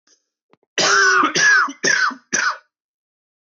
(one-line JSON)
{"cough_length": "3.5 s", "cough_amplitude": 18818, "cough_signal_mean_std_ratio": 0.57, "survey_phase": "beta (2021-08-13 to 2022-03-07)", "age": "45-64", "gender": "Male", "wearing_mask": "No", "symptom_cough_any": true, "symptom_fatigue": true, "symptom_headache": true, "smoker_status": "Never smoked", "respiratory_condition_asthma": true, "respiratory_condition_other": false, "recruitment_source": "REACT", "submission_delay": "2 days", "covid_test_result": "Negative", "covid_test_method": "RT-qPCR", "influenza_a_test_result": "Negative", "influenza_b_test_result": "Negative"}